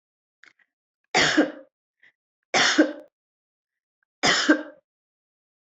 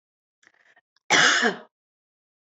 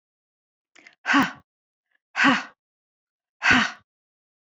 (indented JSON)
{
  "three_cough_length": "5.6 s",
  "three_cough_amplitude": 19984,
  "three_cough_signal_mean_std_ratio": 0.34,
  "cough_length": "2.6 s",
  "cough_amplitude": 17653,
  "cough_signal_mean_std_ratio": 0.33,
  "exhalation_length": "4.5 s",
  "exhalation_amplitude": 17379,
  "exhalation_signal_mean_std_ratio": 0.32,
  "survey_phase": "beta (2021-08-13 to 2022-03-07)",
  "age": "45-64",
  "gender": "Female",
  "wearing_mask": "No",
  "symptom_none": true,
  "smoker_status": "Never smoked",
  "respiratory_condition_asthma": false,
  "respiratory_condition_other": false,
  "recruitment_source": "REACT",
  "submission_delay": "1 day",
  "covid_test_result": "Negative",
  "covid_test_method": "RT-qPCR",
  "influenza_a_test_result": "Negative",
  "influenza_b_test_result": "Negative"
}